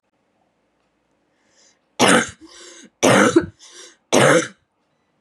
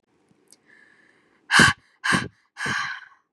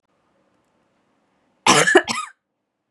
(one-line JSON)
{"three_cough_length": "5.2 s", "three_cough_amplitude": 32767, "three_cough_signal_mean_std_ratio": 0.36, "exhalation_length": "3.3 s", "exhalation_amplitude": 25254, "exhalation_signal_mean_std_ratio": 0.34, "cough_length": "2.9 s", "cough_amplitude": 32767, "cough_signal_mean_std_ratio": 0.3, "survey_phase": "beta (2021-08-13 to 2022-03-07)", "age": "18-44", "gender": "Female", "wearing_mask": "No", "symptom_none": true, "smoker_status": "Never smoked", "respiratory_condition_asthma": false, "respiratory_condition_other": false, "recruitment_source": "REACT", "submission_delay": "5 days", "covid_test_result": "Negative", "covid_test_method": "RT-qPCR"}